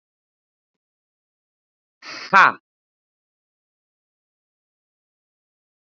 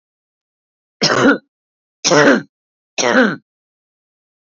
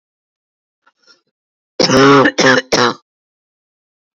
{"exhalation_length": "6.0 s", "exhalation_amplitude": 27939, "exhalation_signal_mean_std_ratio": 0.13, "three_cough_length": "4.4 s", "three_cough_amplitude": 31648, "three_cough_signal_mean_std_ratio": 0.39, "cough_length": "4.2 s", "cough_amplitude": 32762, "cough_signal_mean_std_ratio": 0.4, "survey_phase": "beta (2021-08-13 to 2022-03-07)", "age": "45-64", "gender": "Female", "wearing_mask": "No", "symptom_shortness_of_breath": true, "symptom_abdominal_pain": true, "symptom_diarrhoea": true, "symptom_fatigue": true, "symptom_headache": true, "symptom_onset": "13 days", "smoker_status": "Current smoker (11 or more cigarettes per day)", "respiratory_condition_asthma": false, "respiratory_condition_other": false, "recruitment_source": "REACT", "submission_delay": "2 days", "covid_test_result": "Negative", "covid_test_method": "RT-qPCR"}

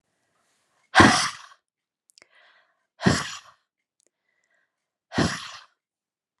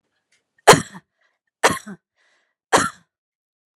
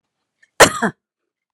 {"exhalation_length": "6.4 s", "exhalation_amplitude": 31864, "exhalation_signal_mean_std_ratio": 0.25, "three_cough_length": "3.8 s", "three_cough_amplitude": 32768, "three_cough_signal_mean_std_ratio": 0.23, "cough_length": "1.5 s", "cough_amplitude": 32768, "cough_signal_mean_std_ratio": 0.25, "survey_phase": "alpha (2021-03-01 to 2021-08-12)", "age": "45-64", "gender": "Female", "wearing_mask": "No", "symptom_none": true, "symptom_onset": "13 days", "smoker_status": "Never smoked", "respiratory_condition_asthma": false, "respiratory_condition_other": false, "recruitment_source": "REACT", "submission_delay": "1 day", "covid_test_result": "Negative", "covid_test_method": "RT-qPCR"}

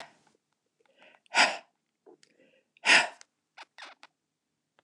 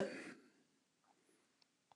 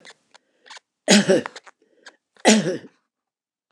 {"exhalation_length": "4.8 s", "exhalation_amplitude": 17430, "exhalation_signal_mean_std_ratio": 0.23, "cough_length": "2.0 s", "cough_amplitude": 1254, "cough_signal_mean_std_ratio": 0.32, "three_cough_length": "3.7 s", "three_cough_amplitude": 29204, "three_cough_signal_mean_std_ratio": 0.32, "survey_phase": "beta (2021-08-13 to 2022-03-07)", "age": "65+", "gender": "Male", "wearing_mask": "No", "symptom_none": true, "smoker_status": "Never smoked", "respiratory_condition_asthma": false, "respiratory_condition_other": false, "recruitment_source": "REACT", "submission_delay": "2 days", "covid_test_result": "Negative", "covid_test_method": "RT-qPCR", "influenza_a_test_result": "Negative", "influenza_b_test_result": "Negative"}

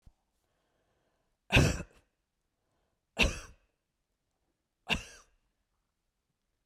{"three_cough_length": "6.7 s", "three_cough_amplitude": 9643, "three_cough_signal_mean_std_ratio": 0.22, "survey_phase": "beta (2021-08-13 to 2022-03-07)", "age": "65+", "gender": "Female", "wearing_mask": "No", "symptom_none": true, "smoker_status": "Never smoked", "respiratory_condition_asthma": false, "respiratory_condition_other": false, "recruitment_source": "REACT", "submission_delay": "2 days", "covid_test_result": "Negative", "covid_test_method": "RT-qPCR", "influenza_a_test_result": "Unknown/Void", "influenza_b_test_result": "Unknown/Void"}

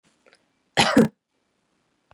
{"cough_length": "2.1 s", "cough_amplitude": 19801, "cough_signal_mean_std_ratio": 0.27, "survey_phase": "beta (2021-08-13 to 2022-03-07)", "age": "18-44", "gender": "Female", "wearing_mask": "No", "symptom_runny_or_blocked_nose": true, "symptom_fatigue": true, "symptom_headache": true, "smoker_status": "Ex-smoker", "respiratory_condition_asthma": false, "respiratory_condition_other": false, "recruitment_source": "Test and Trace", "submission_delay": "1 day", "covid_test_result": "Positive", "covid_test_method": "RT-qPCR", "covid_ct_value": 19.5, "covid_ct_gene": "ORF1ab gene"}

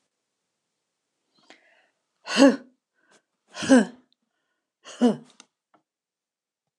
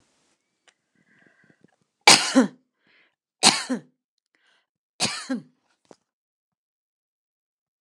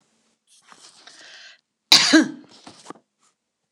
{"exhalation_length": "6.8 s", "exhalation_amplitude": 25203, "exhalation_signal_mean_std_ratio": 0.23, "three_cough_length": "7.8 s", "three_cough_amplitude": 29204, "three_cough_signal_mean_std_ratio": 0.22, "cough_length": "3.7 s", "cough_amplitude": 29204, "cough_signal_mean_std_ratio": 0.25, "survey_phase": "beta (2021-08-13 to 2022-03-07)", "age": "65+", "gender": "Female", "wearing_mask": "No", "symptom_none": true, "smoker_status": "Never smoked", "respiratory_condition_asthma": false, "respiratory_condition_other": false, "recruitment_source": "REACT", "submission_delay": "0 days", "covid_test_result": "Negative", "covid_test_method": "RT-qPCR"}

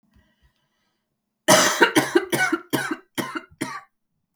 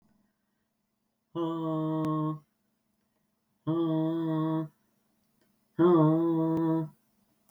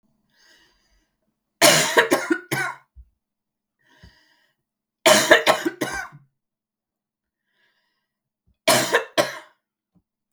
{"cough_length": "4.4 s", "cough_amplitude": 32766, "cough_signal_mean_std_ratio": 0.41, "exhalation_length": "7.5 s", "exhalation_amplitude": 9201, "exhalation_signal_mean_std_ratio": 0.55, "three_cough_length": "10.3 s", "three_cough_amplitude": 32768, "three_cough_signal_mean_std_ratio": 0.32, "survey_phase": "beta (2021-08-13 to 2022-03-07)", "age": "45-64", "gender": "Female", "wearing_mask": "No", "symptom_cough_any": true, "symptom_runny_or_blocked_nose": true, "symptom_sore_throat": true, "symptom_fatigue": true, "symptom_headache": true, "symptom_onset": "5 days", "smoker_status": "Never smoked", "respiratory_condition_asthma": false, "respiratory_condition_other": false, "recruitment_source": "Test and Trace", "submission_delay": "3 days", "covid_test_result": "Positive", "covid_test_method": "RT-qPCR", "covid_ct_value": 18.5, "covid_ct_gene": "N gene"}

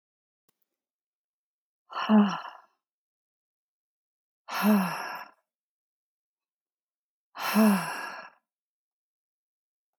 {"exhalation_length": "10.0 s", "exhalation_amplitude": 9401, "exhalation_signal_mean_std_ratio": 0.31, "survey_phase": "alpha (2021-03-01 to 2021-08-12)", "age": "45-64", "gender": "Female", "wearing_mask": "No", "symptom_none": true, "smoker_status": "Never smoked", "respiratory_condition_asthma": false, "respiratory_condition_other": false, "recruitment_source": "REACT", "submission_delay": "0 days", "covid_test_result": "Negative", "covid_test_method": "RT-qPCR"}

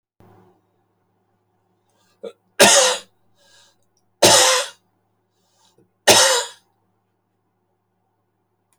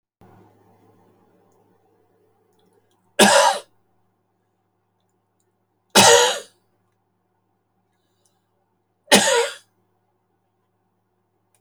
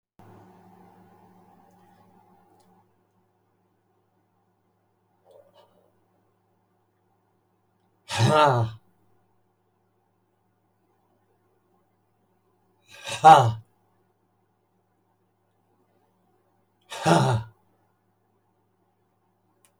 {"three_cough_length": "8.8 s", "three_cough_amplitude": 32767, "three_cough_signal_mean_std_ratio": 0.29, "cough_length": "11.6 s", "cough_amplitude": 30209, "cough_signal_mean_std_ratio": 0.25, "exhalation_length": "19.8 s", "exhalation_amplitude": 26637, "exhalation_signal_mean_std_ratio": 0.2, "survey_phase": "beta (2021-08-13 to 2022-03-07)", "age": "65+", "gender": "Male", "wearing_mask": "No", "symptom_cough_any": true, "symptom_shortness_of_breath": true, "smoker_status": "Never smoked", "respiratory_condition_asthma": false, "respiratory_condition_other": true, "recruitment_source": "REACT", "submission_delay": "2 days", "covid_test_result": "Negative", "covid_test_method": "RT-qPCR"}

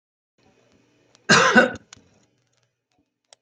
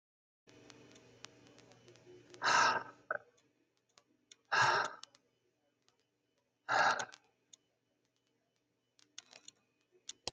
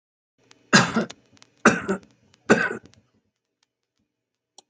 {"cough_length": "3.4 s", "cough_amplitude": 28808, "cough_signal_mean_std_ratio": 0.27, "exhalation_length": "10.3 s", "exhalation_amplitude": 4321, "exhalation_signal_mean_std_ratio": 0.29, "three_cough_length": "4.7 s", "three_cough_amplitude": 27792, "three_cough_signal_mean_std_ratio": 0.28, "survey_phase": "alpha (2021-03-01 to 2021-08-12)", "age": "65+", "gender": "Male", "wearing_mask": "No", "symptom_none": true, "smoker_status": "Ex-smoker", "respiratory_condition_asthma": false, "respiratory_condition_other": false, "recruitment_source": "REACT", "submission_delay": "2 days", "covid_test_result": "Negative", "covid_test_method": "RT-qPCR"}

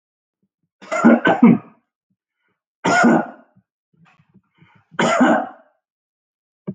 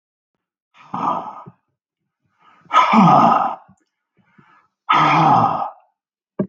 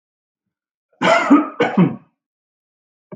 {"three_cough_length": "6.7 s", "three_cough_amplitude": 32640, "three_cough_signal_mean_std_ratio": 0.37, "exhalation_length": "6.5 s", "exhalation_amplitude": 31731, "exhalation_signal_mean_std_ratio": 0.45, "cough_length": "3.2 s", "cough_amplitude": 32766, "cough_signal_mean_std_ratio": 0.38, "survey_phase": "beta (2021-08-13 to 2022-03-07)", "age": "45-64", "gender": "Male", "wearing_mask": "No", "symptom_none": true, "smoker_status": "Ex-smoker", "respiratory_condition_asthma": false, "respiratory_condition_other": false, "recruitment_source": "REACT", "submission_delay": "2 days", "covid_test_result": "Negative", "covid_test_method": "RT-qPCR", "influenza_a_test_result": "Negative", "influenza_b_test_result": "Negative"}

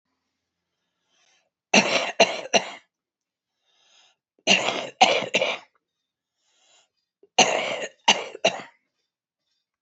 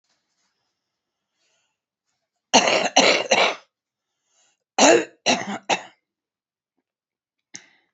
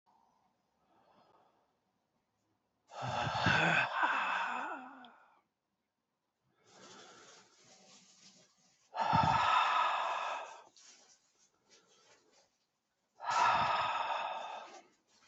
{"three_cough_length": "9.8 s", "three_cough_amplitude": 26018, "three_cough_signal_mean_std_ratio": 0.33, "cough_length": "7.9 s", "cough_amplitude": 28464, "cough_signal_mean_std_ratio": 0.32, "exhalation_length": "15.3 s", "exhalation_amplitude": 4200, "exhalation_signal_mean_std_ratio": 0.46, "survey_phase": "alpha (2021-03-01 to 2021-08-12)", "age": "65+", "gender": "Female", "wearing_mask": "No", "symptom_cough_any": true, "symptom_fatigue": true, "symptom_headache": true, "symptom_change_to_sense_of_smell_or_taste": true, "symptom_loss_of_taste": true, "symptom_onset": "7 days", "smoker_status": "Ex-smoker", "respiratory_condition_asthma": false, "respiratory_condition_other": false, "recruitment_source": "Test and Trace", "submission_delay": "2 days", "covid_test_result": "Positive", "covid_test_method": "RT-qPCR", "covid_ct_value": 28.4, "covid_ct_gene": "ORF1ab gene"}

